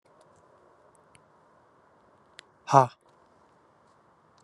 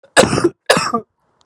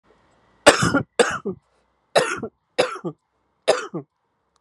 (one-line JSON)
{"exhalation_length": "4.4 s", "exhalation_amplitude": 25807, "exhalation_signal_mean_std_ratio": 0.14, "cough_length": "1.5 s", "cough_amplitude": 32768, "cough_signal_mean_std_ratio": 0.48, "three_cough_length": "4.6 s", "three_cough_amplitude": 32768, "three_cough_signal_mean_std_ratio": 0.35, "survey_phase": "beta (2021-08-13 to 2022-03-07)", "age": "45-64", "gender": "Male", "wearing_mask": "No", "symptom_cough_any": true, "symptom_new_continuous_cough": true, "symptom_runny_or_blocked_nose": true, "symptom_shortness_of_breath": true, "symptom_sore_throat": true, "symptom_diarrhoea": true, "symptom_change_to_sense_of_smell_or_taste": true, "symptom_loss_of_taste": true, "smoker_status": "Current smoker (11 or more cigarettes per day)", "respiratory_condition_asthma": false, "respiratory_condition_other": false, "recruitment_source": "Test and Trace", "submission_delay": "3 days", "covid_test_result": "Positive", "covid_test_method": "RT-qPCR", "covid_ct_value": 14.8, "covid_ct_gene": "ORF1ab gene", "covid_ct_mean": 15.1, "covid_viral_load": "11000000 copies/ml", "covid_viral_load_category": "High viral load (>1M copies/ml)"}